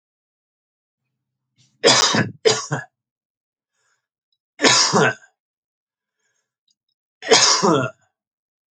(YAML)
three_cough_length: 8.7 s
three_cough_amplitude: 32767
three_cough_signal_mean_std_ratio: 0.36
survey_phase: alpha (2021-03-01 to 2021-08-12)
age: 45-64
gender: Male
wearing_mask: 'No'
symptom_none: true
symptom_onset: 6 days
smoker_status: Never smoked
respiratory_condition_asthma: false
respiratory_condition_other: false
recruitment_source: REACT
submission_delay: 3 days
covid_test_result: Negative
covid_test_method: RT-qPCR